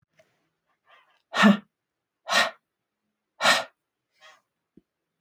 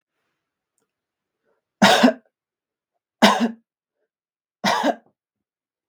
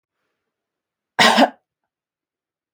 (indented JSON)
{
  "exhalation_length": "5.2 s",
  "exhalation_amplitude": 16644,
  "exhalation_signal_mean_std_ratio": 0.27,
  "three_cough_length": "5.9 s",
  "three_cough_amplitude": 32766,
  "three_cough_signal_mean_std_ratio": 0.29,
  "cough_length": "2.7 s",
  "cough_amplitude": 32768,
  "cough_signal_mean_std_ratio": 0.26,
  "survey_phase": "beta (2021-08-13 to 2022-03-07)",
  "age": "18-44",
  "gender": "Female",
  "wearing_mask": "No",
  "symptom_runny_or_blocked_nose": true,
  "smoker_status": "Never smoked",
  "respiratory_condition_asthma": false,
  "respiratory_condition_other": false,
  "recruitment_source": "REACT",
  "submission_delay": "2 days",
  "covid_test_result": "Negative",
  "covid_test_method": "RT-qPCR",
  "influenza_a_test_result": "Unknown/Void",
  "influenza_b_test_result": "Unknown/Void"
}